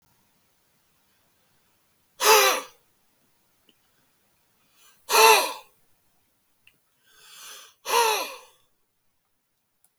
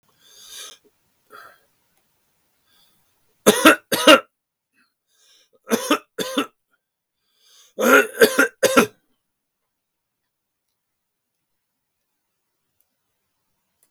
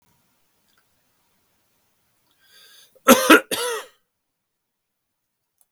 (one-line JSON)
{"exhalation_length": "10.0 s", "exhalation_amplitude": 25086, "exhalation_signal_mean_std_ratio": 0.27, "three_cough_length": "13.9 s", "three_cough_amplitude": 32768, "three_cough_signal_mean_std_ratio": 0.24, "cough_length": "5.7 s", "cough_amplitude": 32768, "cough_signal_mean_std_ratio": 0.2, "survey_phase": "beta (2021-08-13 to 2022-03-07)", "age": "65+", "gender": "Male", "wearing_mask": "No", "symptom_none": true, "smoker_status": "Ex-smoker", "respiratory_condition_asthma": false, "respiratory_condition_other": false, "recruitment_source": "REACT", "submission_delay": "2 days", "covid_test_result": "Negative", "covid_test_method": "RT-qPCR", "influenza_a_test_result": "Unknown/Void", "influenza_b_test_result": "Unknown/Void"}